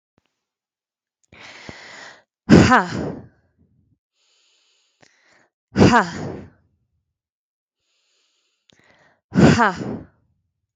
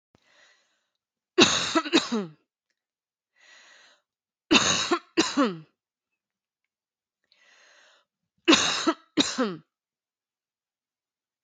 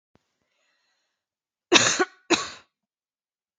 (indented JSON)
{
  "exhalation_length": "10.8 s",
  "exhalation_amplitude": 32768,
  "exhalation_signal_mean_std_ratio": 0.27,
  "three_cough_length": "11.4 s",
  "three_cough_amplitude": 32186,
  "three_cough_signal_mean_std_ratio": 0.32,
  "cough_length": "3.6 s",
  "cough_amplitude": 32360,
  "cough_signal_mean_std_ratio": 0.26,
  "survey_phase": "beta (2021-08-13 to 2022-03-07)",
  "age": "18-44",
  "gender": "Female",
  "wearing_mask": "No",
  "symptom_runny_or_blocked_nose": true,
  "symptom_sore_throat": true,
  "symptom_fatigue": true,
  "symptom_onset": "13 days",
  "smoker_status": "Ex-smoker",
  "respiratory_condition_asthma": false,
  "respiratory_condition_other": false,
  "recruitment_source": "REACT",
  "submission_delay": "1 day",
  "covid_test_result": "Negative",
  "covid_test_method": "RT-qPCR",
  "influenza_a_test_result": "Negative",
  "influenza_b_test_result": "Negative"
}